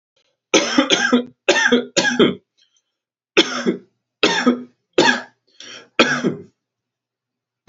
{"three_cough_length": "7.7 s", "three_cough_amplitude": 32434, "three_cough_signal_mean_std_ratio": 0.45, "survey_phase": "alpha (2021-03-01 to 2021-08-12)", "age": "18-44", "gender": "Male", "wearing_mask": "No", "symptom_none": true, "smoker_status": "Never smoked", "respiratory_condition_asthma": false, "respiratory_condition_other": false, "recruitment_source": "REACT", "submission_delay": "2 days", "covid_test_result": "Negative", "covid_test_method": "RT-qPCR"}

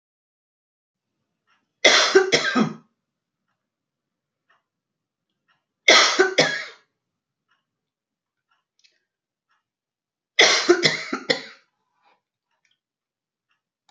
{"three_cough_length": "13.9 s", "three_cough_amplitude": 32767, "three_cough_signal_mean_std_ratio": 0.29, "survey_phase": "beta (2021-08-13 to 2022-03-07)", "age": "45-64", "gender": "Female", "wearing_mask": "No", "symptom_cough_any": true, "symptom_fatigue": true, "symptom_change_to_sense_of_smell_or_taste": true, "symptom_other": true, "symptom_onset": "2 days", "smoker_status": "Never smoked", "respiratory_condition_asthma": false, "respiratory_condition_other": false, "recruitment_source": "Test and Trace", "submission_delay": "1 day", "covid_test_result": "Positive", "covid_test_method": "RT-qPCR", "covid_ct_value": 29.9, "covid_ct_gene": "ORF1ab gene"}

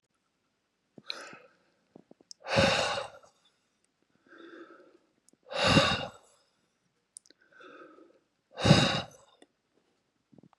{"exhalation_length": "10.6 s", "exhalation_amplitude": 14988, "exhalation_signal_mean_std_ratio": 0.3, "survey_phase": "beta (2021-08-13 to 2022-03-07)", "age": "65+", "gender": "Male", "wearing_mask": "No", "symptom_none": true, "smoker_status": "Never smoked", "respiratory_condition_asthma": false, "respiratory_condition_other": false, "recruitment_source": "REACT", "submission_delay": "2 days", "covid_test_result": "Negative", "covid_test_method": "RT-qPCR", "influenza_a_test_result": "Unknown/Void", "influenza_b_test_result": "Unknown/Void"}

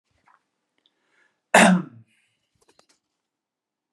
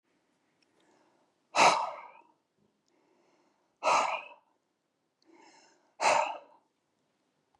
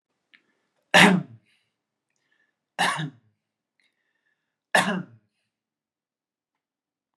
{"cough_length": "3.9 s", "cough_amplitude": 28008, "cough_signal_mean_std_ratio": 0.22, "exhalation_length": "7.6 s", "exhalation_amplitude": 12098, "exhalation_signal_mean_std_ratio": 0.29, "three_cough_length": "7.2 s", "three_cough_amplitude": 26808, "three_cough_signal_mean_std_ratio": 0.23, "survey_phase": "beta (2021-08-13 to 2022-03-07)", "age": "18-44", "gender": "Male", "wearing_mask": "No", "symptom_none": true, "smoker_status": "Never smoked", "respiratory_condition_asthma": false, "respiratory_condition_other": false, "recruitment_source": "REACT", "submission_delay": "3 days", "covid_test_result": "Negative", "covid_test_method": "RT-qPCR", "influenza_a_test_result": "Negative", "influenza_b_test_result": "Negative"}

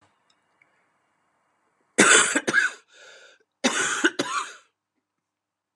{"three_cough_length": "5.8 s", "three_cough_amplitude": 27036, "three_cough_signal_mean_std_ratio": 0.35, "survey_phase": "beta (2021-08-13 to 2022-03-07)", "age": "18-44", "gender": "Male", "wearing_mask": "No", "symptom_cough_any": true, "symptom_new_continuous_cough": true, "symptom_runny_or_blocked_nose": true, "symptom_sore_throat": true, "symptom_fatigue": true, "symptom_fever_high_temperature": true, "symptom_onset": "4 days", "smoker_status": "Never smoked", "respiratory_condition_asthma": false, "respiratory_condition_other": false, "recruitment_source": "REACT", "submission_delay": "0 days", "covid_test_result": "Negative", "covid_test_method": "RT-qPCR", "influenza_a_test_result": "Unknown/Void", "influenza_b_test_result": "Unknown/Void"}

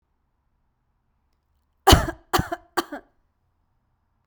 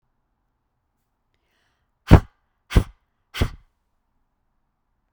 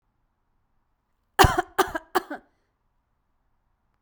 {"three_cough_length": "4.3 s", "three_cough_amplitude": 32768, "three_cough_signal_mean_std_ratio": 0.21, "exhalation_length": "5.1 s", "exhalation_amplitude": 32768, "exhalation_signal_mean_std_ratio": 0.16, "cough_length": "4.0 s", "cough_amplitude": 29831, "cough_signal_mean_std_ratio": 0.22, "survey_phase": "beta (2021-08-13 to 2022-03-07)", "age": "18-44", "gender": "Female", "wearing_mask": "No", "symptom_cough_any": true, "smoker_status": "Ex-smoker", "respiratory_condition_asthma": false, "respiratory_condition_other": false, "recruitment_source": "REACT", "submission_delay": "1 day", "covid_test_result": "Negative", "covid_test_method": "RT-qPCR"}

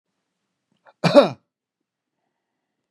{"cough_length": "2.9 s", "cough_amplitude": 32737, "cough_signal_mean_std_ratio": 0.2, "survey_phase": "beta (2021-08-13 to 2022-03-07)", "age": "65+", "gender": "Male", "wearing_mask": "No", "symptom_none": true, "smoker_status": "Ex-smoker", "respiratory_condition_asthma": true, "respiratory_condition_other": false, "recruitment_source": "REACT", "submission_delay": "2 days", "covid_test_result": "Negative", "covid_test_method": "RT-qPCR", "influenza_a_test_result": "Negative", "influenza_b_test_result": "Negative"}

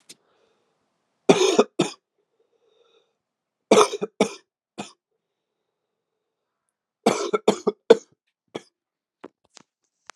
{"three_cough_length": "10.2 s", "three_cough_amplitude": 32693, "three_cough_signal_mean_std_ratio": 0.23, "survey_phase": "alpha (2021-03-01 to 2021-08-12)", "age": "18-44", "gender": "Male", "wearing_mask": "No", "symptom_cough_any": true, "symptom_new_continuous_cough": true, "symptom_fatigue": true, "symptom_onset": "2 days", "smoker_status": "Never smoked", "respiratory_condition_asthma": false, "respiratory_condition_other": false, "recruitment_source": "Test and Trace", "submission_delay": "1 day", "covid_test_result": "Positive", "covid_test_method": "RT-qPCR", "covid_ct_value": 20.4, "covid_ct_gene": "N gene", "covid_ct_mean": 20.6, "covid_viral_load": "170000 copies/ml", "covid_viral_load_category": "Low viral load (10K-1M copies/ml)"}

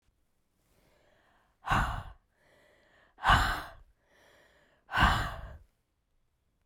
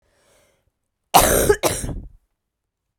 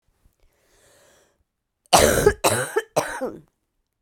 {"exhalation_length": "6.7 s", "exhalation_amplitude": 11030, "exhalation_signal_mean_std_ratio": 0.33, "cough_length": "3.0 s", "cough_amplitude": 32768, "cough_signal_mean_std_ratio": 0.36, "three_cough_length": "4.0 s", "three_cough_amplitude": 32768, "three_cough_signal_mean_std_ratio": 0.36, "survey_phase": "beta (2021-08-13 to 2022-03-07)", "age": "45-64", "gender": "Female", "wearing_mask": "No", "symptom_cough_any": true, "symptom_runny_or_blocked_nose": true, "symptom_headache": true, "symptom_onset": "3 days", "smoker_status": "Never smoked", "respiratory_condition_asthma": false, "respiratory_condition_other": false, "recruitment_source": "Test and Trace", "submission_delay": "2 days", "covid_test_result": "Positive", "covid_test_method": "ePCR"}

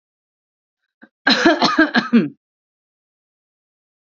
{"cough_length": "4.0 s", "cough_amplitude": 27871, "cough_signal_mean_std_ratio": 0.36, "survey_phase": "alpha (2021-03-01 to 2021-08-12)", "age": "18-44", "gender": "Female", "wearing_mask": "No", "symptom_none": true, "smoker_status": "Never smoked", "respiratory_condition_asthma": false, "respiratory_condition_other": false, "recruitment_source": "REACT", "submission_delay": "1 day", "covid_test_result": "Negative", "covid_test_method": "RT-qPCR"}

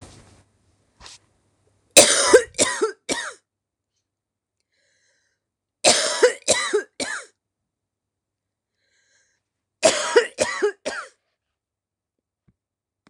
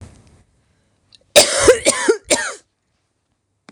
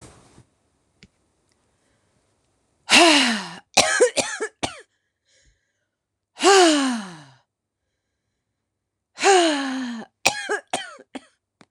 {"three_cough_length": "13.1 s", "three_cough_amplitude": 26028, "three_cough_signal_mean_std_ratio": 0.31, "cough_length": "3.7 s", "cough_amplitude": 26028, "cough_signal_mean_std_ratio": 0.36, "exhalation_length": "11.7 s", "exhalation_amplitude": 26028, "exhalation_signal_mean_std_ratio": 0.37, "survey_phase": "beta (2021-08-13 to 2022-03-07)", "age": "65+", "gender": "Female", "wearing_mask": "No", "symptom_cough_any": true, "smoker_status": "Never smoked", "respiratory_condition_asthma": true, "respiratory_condition_other": false, "recruitment_source": "REACT", "submission_delay": "2 days", "covid_test_result": "Negative", "covid_test_method": "RT-qPCR", "influenza_a_test_result": "Negative", "influenza_b_test_result": "Negative"}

